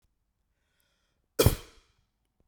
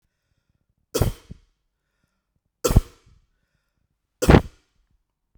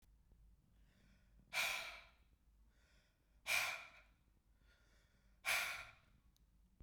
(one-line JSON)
{"cough_length": "2.5 s", "cough_amplitude": 18163, "cough_signal_mean_std_ratio": 0.18, "three_cough_length": "5.4 s", "three_cough_amplitude": 32768, "three_cough_signal_mean_std_ratio": 0.2, "exhalation_length": "6.8 s", "exhalation_amplitude": 1716, "exhalation_signal_mean_std_ratio": 0.37, "survey_phase": "beta (2021-08-13 to 2022-03-07)", "age": "18-44", "gender": "Male", "wearing_mask": "No", "symptom_none": true, "smoker_status": "Never smoked", "respiratory_condition_asthma": false, "respiratory_condition_other": false, "recruitment_source": "REACT", "submission_delay": "1 day", "covid_test_result": "Negative", "covid_test_method": "RT-qPCR"}